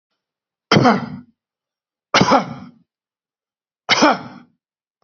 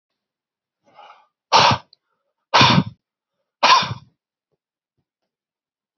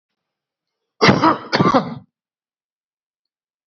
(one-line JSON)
{"three_cough_length": "5.0 s", "three_cough_amplitude": 32768, "three_cough_signal_mean_std_ratio": 0.34, "exhalation_length": "6.0 s", "exhalation_amplitude": 30415, "exhalation_signal_mean_std_ratio": 0.3, "cough_length": "3.7 s", "cough_amplitude": 29833, "cough_signal_mean_std_ratio": 0.33, "survey_phase": "beta (2021-08-13 to 2022-03-07)", "age": "45-64", "gender": "Male", "wearing_mask": "No", "symptom_none": true, "smoker_status": "Ex-smoker", "respiratory_condition_asthma": false, "respiratory_condition_other": false, "recruitment_source": "REACT", "submission_delay": "1 day", "covid_test_result": "Negative", "covid_test_method": "RT-qPCR", "influenza_a_test_result": "Negative", "influenza_b_test_result": "Negative"}